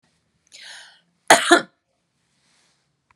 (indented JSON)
{
  "cough_length": "3.2 s",
  "cough_amplitude": 32768,
  "cough_signal_mean_std_ratio": 0.22,
  "survey_phase": "beta (2021-08-13 to 2022-03-07)",
  "age": "45-64",
  "gender": "Female",
  "wearing_mask": "No",
  "symptom_runny_or_blocked_nose": true,
  "smoker_status": "Never smoked",
  "respiratory_condition_asthma": false,
  "respiratory_condition_other": false,
  "recruitment_source": "REACT",
  "submission_delay": "5 days",
  "covid_test_result": "Negative",
  "covid_test_method": "RT-qPCR",
  "influenza_a_test_result": "Negative",
  "influenza_b_test_result": "Negative"
}